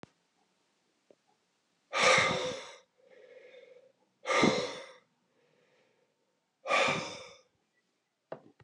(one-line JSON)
{"exhalation_length": "8.6 s", "exhalation_amplitude": 8716, "exhalation_signal_mean_std_ratio": 0.35, "survey_phase": "beta (2021-08-13 to 2022-03-07)", "age": "45-64", "gender": "Male", "wearing_mask": "No", "symptom_cough_any": true, "symptom_runny_or_blocked_nose": true, "symptom_headache": true, "symptom_change_to_sense_of_smell_or_taste": true, "symptom_loss_of_taste": true, "symptom_onset": "6 days", "smoker_status": "Ex-smoker", "respiratory_condition_asthma": false, "respiratory_condition_other": false, "recruitment_source": "Test and Trace", "submission_delay": "2 days", "covid_test_result": "Positive", "covid_test_method": "RT-qPCR"}